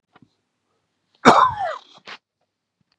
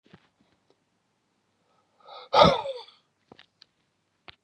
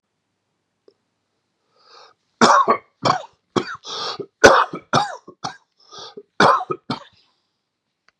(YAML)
cough_length: 3.0 s
cough_amplitude: 32768
cough_signal_mean_std_ratio: 0.27
exhalation_length: 4.4 s
exhalation_amplitude: 26874
exhalation_signal_mean_std_ratio: 0.21
three_cough_length: 8.2 s
three_cough_amplitude: 32768
three_cough_signal_mean_std_ratio: 0.32
survey_phase: beta (2021-08-13 to 2022-03-07)
age: 45-64
gender: Male
wearing_mask: 'No'
symptom_none: true
smoker_status: Never smoked
respiratory_condition_asthma: false
respiratory_condition_other: false
recruitment_source: REACT
submission_delay: 1 day
covid_test_result: Negative
covid_test_method: RT-qPCR